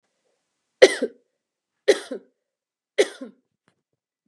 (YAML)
three_cough_length: 4.3 s
three_cough_amplitude: 32768
three_cough_signal_mean_std_ratio: 0.2
survey_phase: beta (2021-08-13 to 2022-03-07)
age: 45-64
gender: Female
wearing_mask: 'No'
symptom_none: true
smoker_status: Ex-smoker
respiratory_condition_asthma: false
respiratory_condition_other: false
recruitment_source: REACT
submission_delay: 2 days
covid_test_result: Negative
covid_test_method: RT-qPCR
influenza_a_test_result: Negative
influenza_b_test_result: Negative